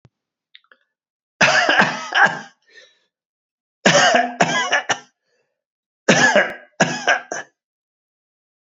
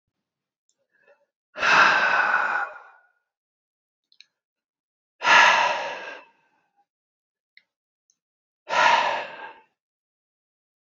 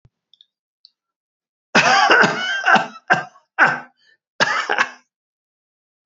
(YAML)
three_cough_length: 8.6 s
three_cough_amplitude: 30130
three_cough_signal_mean_std_ratio: 0.43
exhalation_length: 10.8 s
exhalation_amplitude: 24314
exhalation_signal_mean_std_ratio: 0.37
cough_length: 6.1 s
cough_amplitude: 28935
cough_signal_mean_std_ratio: 0.42
survey_phase: beta (2021-08-13 to 2022-03-07)
age: 65+
gender: Male
wearing_mask: 'No'
symptom_none: true
smoker_status: Never smoked
respiratory_condition_asthma: false
respiratory_condition_other: false
recruitment_source: REACT
submission_delay: 1 day
covid_test_result: Negative
covid_test_method: RT-qPCR
influenza_a_test_result: Negative
influenza_b_test_result: Negative